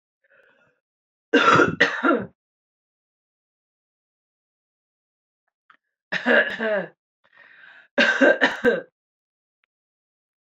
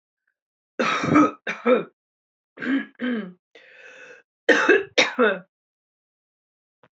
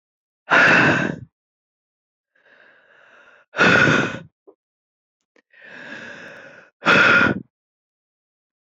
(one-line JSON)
{"three_cough_length": "10.5 s", "three_cough_amplitude": 25598, "three_cough_signal_mean_std_ratio": 0.34, "cough_length": "7.0 s", "cough_amplitude": 25877, "cough_signal_mean_std_ratio": 0.4, "exhalation_length": "8.6 s", "exhalation_amplitude": 25610, "exhalation_signal_mean_std_ratio": 0.39, "survey_phase": "beta (2021-08-13 to 2022-03-07)", "age": "18-44", "gender": "Female", "wearing_mask": "No", "symptom_cough_any": true, "symptom_shortness_of_breath": true, "symptom_sore_throat": true, "symptom_fatigue": true, "symptom_change_to_sense_of_smell_or_taste": true, "symptom_other": true, "symptom_onset": "3 days", "smoker_status": "Prefer not to say", "respiratory_condition_asthma": false, "respiratory_condition_other": false, "recruitment_source": "Test and Trace", "submission_delay": "2 days", "covid_test_result": "Positive", "covid_test_method": "RT-qPCR", "covid_ct_value": 14.6, "covid_ct_gene": "ORF1ab gene", "covid_ct_mean": 18.2, "covid_viral_load": "1000000 copies/ml", "covid_viral_load_category": "High viral load (>1M copies/ml)"}